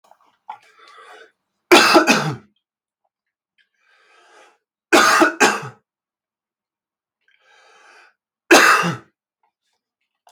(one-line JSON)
{"three_cough_length": "10.3 s", "three_cough_amplitude": 32768, "three_cough_signal_mean_std_ratio": 0.31, "survey_phase": "beta (2021-08-13 to 2022-03-07)", "age": "18-44", "gender": "Male", "wearing_mask": "No", "symptom_cough_any": true, "symptom_runny_or_blocked_nose": true, "symptom_fatigue": true, "symptom_change_to_sense_of_smell_or_taste": true, "symptom_onset": "2 days", "smoker_status": "Never smoked", "respiratory_condition_asthma": false, "respiratory_condition_other": false, "recruitment_source": "Test and Trace", "submission_delay": "1 day", "covid_test_result": "Positive", "covid_test_method": "RT-qPCR", "covid_ct_value": 13.4, "covid_ct_gene": "ORF1ab gene", "covid_ct_mean": 13.9, "covid_viral_load": "28000000 copies/ml", "covid_viral_load_category": "High viral load (>1M copies/ml)"}